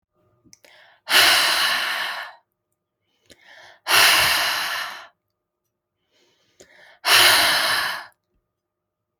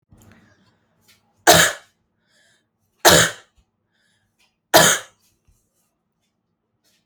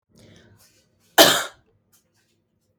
exhalation_length: 9.2 s
exhalation_amplitude: 29637
exhalation_signal_mean_std_ratio: 0.46
three_cough_length: 7.1 s
three_cough_amplitude: 32768
three_cough_signal_mean_std_ratio: 0.26
cough_length: 2.8 s
cough_amplitude: 32767
cough_signal_mean_std_ratio: 0.22
survey_phase: alpha (2021-03-01 to 2021-08-12)
age: 18-44
gender: Female
wearing_mask: 'No'
symptom_none: true
smoker_status: Never smoked
respiratory_condition_asthma: false
respiratory_condition_other: false
recruitment_source: REACT
submission_delay: 2 days
covid_test_result: Negative
covid_test_method: RT-qPCR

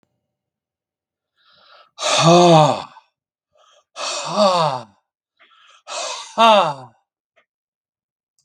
exhalation_length: 8.4 s
exhalation_amplitude: 32766
exhalation_signal_mean_std_ratio: 0.38
survey_phase: beta (2021-08-13 to 2022-03-07)
age: 65+
gender: Male
wearing_mask: 'No'
symptom_none: true
smoker_status: Never smoked
respiratory_condition_asthma: false
respiratory_condition_other: false
recruitment_source: REACT
submission_delay: 0 days
covid_test_result: Negative
covid_test_method: RT-qPCR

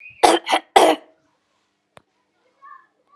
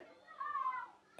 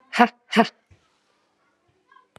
three_cough_length: 3.2 s
three_cough_amplitude: 32768
three_cough_signal_mean_std_ratio: 0.29
cough_length: 1.2 s
cough_amplitude: 1089
cough_signal_mean_std_ratio: 0.67
exhalation_length: 2.4 s
exhalation_amplitude: 32154
exhalation_signal_mean_std_ratio: 0.23
survey_phase: beta (2021-08-13 to 2022-03-07)
age: 45-64
gender: Female
wearing_mask: 'Yes'
symptom_abdominal_pain: true
symptom_headache: true
smoker_status: Never smoked
respiratory_condition_asthma: false
respiratory_condition_other: false
recruitment_source: Test and Trace
submission_delay: 2 days
covid_test_result: Negative
covid_test_method: RT-qPCR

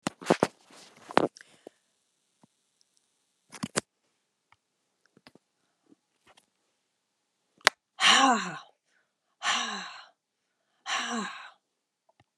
exhalation_length: 12.4 s
exhalation_amplitude: 32768
exhalation_signal_mean_std_ratio: 0.25
survey_phase: beta (2021-08-13 to 2022-03-07)
age: 65+
gender: Female
wearing_mask: 'No'
symptom_runny_or_blocked_nose: true
smoker_status: Never smoked
respiratory_condition_asthma: false
respiratory_condition_other: false
recruitment_source: REACT
submission_delay: 7 days
covid_test_result: Negative
covid_test_method: RT-qPCR
influenza_a_test_result: Negative
influenza_b_test_result: Negative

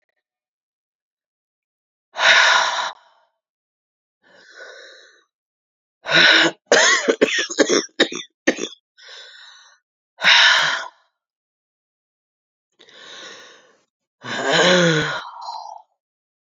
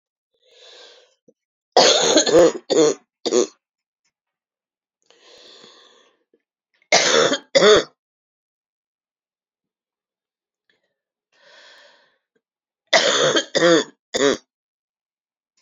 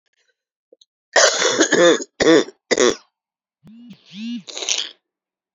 exhalation_length: 16.5 s
exhalation_amplitude: 30898
exhalation_signal_mean_std_ratio: 0.39
three_cough_length: 15.6 s
three_cough_amplitude: 32767
three_cough_signal_mean_std_ratio: 0.34
cough_length: 5.5 s
cough_amplitude: 30233
cough_signal_mean_std_ratio: 0.42
survey_phase: beta (2021-08-13 to 2022-03-07)
age: 45-64
gender: Female
wearing_mask: 'No'
symptom_runny_or_blocked_nose: true
symptom_shortness_of_breath: true
symptom_sore_throat: true
symptom_diarrhoea: true
symptom_fatigue: true
symptom_fever_high_temperature: true
symptom_headache: true
symptom_onset: 3 days
smoker_status: Ex-smoker
respiratory_condition_asthma: false
respiratory_condition_other: false
recruitment_source: Test and Trace
submission_delay: 1 day
covid_test_result: Positive
covid_test_method: RT-qPCR
covid_ct_value: 15.0
covid_ct_gene: ORF1ab gene
covid_ct_mean: 16.4
covid_viral_load: 4300000 copies/ml
covid_viral_load_category: High viral load (>1M copies/ml)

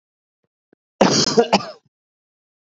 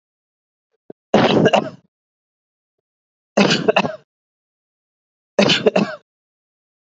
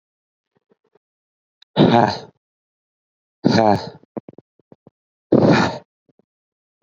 cough_length: 2.7 s
cough_amplitude: 28647
cough_signal_mean_std_ratio: 0.33
three_cough_length: 6.8 s
three_cough_amplitude: 29287
three_cough_signal_mean_std_ratio: 0.34
exhalation_length: 6.8 s
exhalation_amplitude: 28212
exhalation_signal_mean_std_ratio: 0.32
survey_phase: beta (2021-08-13 to 2022-03-07)
age: 18-44
gender: Male
wearing_mask: 'No'
symptom_runny_or_blocked_nose: true
symptom_headache: true
smoker_status: Ex-smoker
respiratory_condition_asthma: false
respiratory_condition_other: false
recruitment_source: Test and Trace
submission_delay: 1 day
covid_test_result: Positive
covid_test_method: RT-qPCR
covid_ct_value: 26.3
covid_ct_gene: ORF1ab gene
covid_ct_mean: 26.4
covid_viral_load: 2100 copies/ml
covid_viral_load_category: Minimal viral load (< 10K copies/ml)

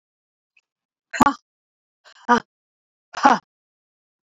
exhalation_length: 4.3 s
exhalation_amplitude: 32768
exhalation_signal_mean_std_ratio: 0.22
survey_phase: beta (2021-08-13 to 2022-03-07)
age: 65+
gender: Female
wearing_mask: 'No'
symptom_none: true
smoker_status: Never smoked
respiratory_condition_asthma: false
respiratory_condition_other: false
recruitment_source: REACT
submission_delay: 3 days
covid_test_result: Negative
covid_test_method: RT-qPCR
influenza_a_test_result: Negative
influenza_b_test_result: Negative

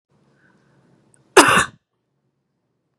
cough_length: 3.0 s
cough_amplitude: 32768
cough_signal_mean_std_ratio: 0.23
survey_phase: beta (2021-08-13 to 2022-03-07)
age: 45-64
gender: Female
wearing_mask: 'No'
symptom_none: true
smoker_status: Never smoked
respiratory_condition_asthma: false
respiratory_condition_other: false
recruitment_source: REACT
submission_delay: 0 days
covid_test_result: Negative
covid_test_method: RT-qPCR
influenza_a_test_result: Negative
influenza_b_test_result: Negative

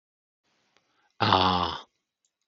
exhalation_length: 2.5 s
exhalation_amplitude: 17824
exhalation_signal_mean_std_ratio: 0.35
survey_phase: beta (2021-08-13 to 2022-03-07)
age: 45-64
gender: Male
wearing_mask: 'No'
symptom_none: true
smoker_status: Never smoked
respiratory_condition_asthma: false
respiratory_condition_other: false
recruitment_source: REACT
submission_delay: 2 days
covid_test_result: Negative
covid_test_method: RT-qPCR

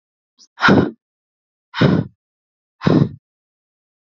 exhalation_length: 4.1 s
exhalation_amplitude: 27496
exhalation_signal_mean_std_ratio: 0.34
survey_phase: beta (2021-08-13 to 2022-03-07)
age: 18-44
gender: Female
wearing_mask: 'No'
symptom_none: true
smoker_status: Never smoked
respiratory_condition_asthma: false
respiratory_condition_other: false
recruitment_source: REACT
submission_delay: 3 days
covid_test_result: Negative
covid_test_method: RT-qPCR
influenza_a_test_result: Negative
influenza_b_test_result: Negative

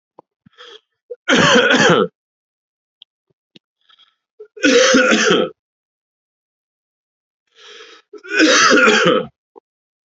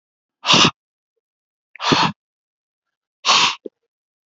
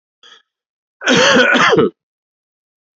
three_cough_length: 10.1 s
three_cough_amplitude: 32767
three_cough_signal_mean_std_ratio: 0.44
exhalation_length: 4.3 s
exhalation_amplitude: 32767
exhalation_signal_mean_std_ratio: 0.34
cough_length: 3.0 s
cough_amplitude: 31334
cough_signal_mean_std_ratio: 0.47
survey_phase: beta (2021-08-13 to 2022-03-07)
age: 18-44
gender: Male
wearing_mask: 'No'
symptom_cough_any: true
symptom_runny_or_blocked_nose: true
symptom_fatigue: true
symptom_headache: true
symptom_other: true
symptom_onset: 5 days
smoker_status: Never smoked
respiratory_condition_asthma: false
respiratory_condition_other: false
recruitment_source: Test and Trace
submission_delay: 2 days
covid_test_result: Positive
covid_test_method: RT-qPCR
covid_ct_value: 18.3
covid_ct_gene: N gene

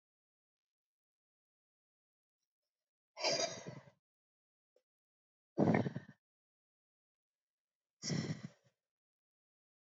exhalation_length: 9.8 s
exhalation_amplitude: 4486
exhalation_signal_mean_std_ratio: 0.25
survey_phase: beta (2021-08-13 to 2022-03-07)
age: 45-64
gender: Female
wearing_mask: 'No'
symptom_cough_any: true
symptom_onset: 5 days
smoker_status: Ex-smoker
respiratory_condition_asthma: false
respiratory_condition_other: false
recruitment_source: Test and Trace
submission_delay: 2 days
covid_test_result: Positive
covid_test_method: RT-qPCR
covid_ct_value: 24.6
covid_ct_gene: ORF1ab gene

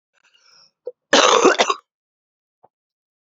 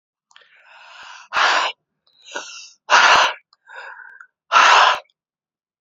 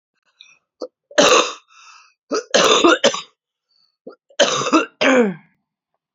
cough_length: 3.2 s
cough_amplitude: 31832
cough_signal_mean_std_ratio: 0.33
exhalation_length: 5.8 s
exhalation_amplitude: 31984
exhalation_signal_mean_std_ratio: 0.4
three_cough_length: 6.1 s
three_cough_amplitude: 32768
three_cough_signal_mean_std_ratio: 0.43
survey_phase: beta (2021-08-13 to 2022-03-07)
age: 18-44
gender: Female
wearing_mask: 'No'
symptom_cough_any: true
symptom_new_continuous_cough: true
symptom_runny_or_blocked_nose: true
symptom_sore_throat: true
symptom_headache: true
symptom_onset: 5 days
smoker_status: Ex-smoker
respiratory_condition_asthma: false
respiratory_condition_other: false
recruitment_source: Test and Trace
submission_delay: 1 day
covid_test_result: Positive
covid_test_method: RT-qPCR
covid_ct_value: 28.2
covid_ct_gene: N gene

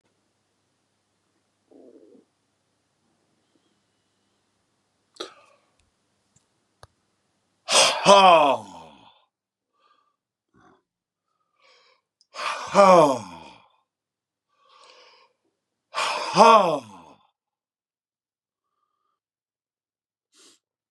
exhalation_length: 20.9 s
exhalation_amplitude: 32410
exhalation_signal_mean_std_ratio: 0.24
survey_phase: beta (2021-08-13 to 2022-03-07)
age: 45-64
gender: Male
wearing_mask: 'No'
symptom_none: true
smoker_status: Current smoker (11 or more cigarettes per day)
respiratory_condition_asthma: false
respiratory_condition_other: false
recruitment_source: Test and Trace
submission_delay: 2 days
covid_test_result: Positive
covid_test_method: ePCR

